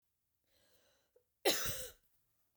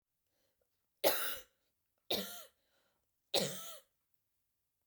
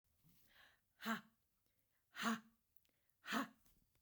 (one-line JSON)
{"cough_length": "2.6 s", "cough_amplitude": 5523, "cough_signal_mean_std_ratio": 0.3, "three_cough_length": "4.9 s", "three_cough_amplitude": 5250, "three_cough_signal_mean_std_ratio": 0.31, "exhalation_length": "4.0 s", "exhalation_amplitude": 1561, "exhalation_signal_mean_std_ratio": 0.32, "survey_phase": "beta (2021-08-13 to 2022-03-07)", "age": "18-44", "gender": "Female", "wearing_mask": "No", "symptom_none": true, "smoker_status": "Ex-smoker", "respiratory_condition_asthma": false, "respiratory_condition_other": false, "recruitment_source": "REACT", "submission_delay": "4 days", "covid_test_result": "Negative", "covid_test_method": "RT-qPCR", "influenza_a_test_result": "Negative", "influenza_b_test_result": "Negative"}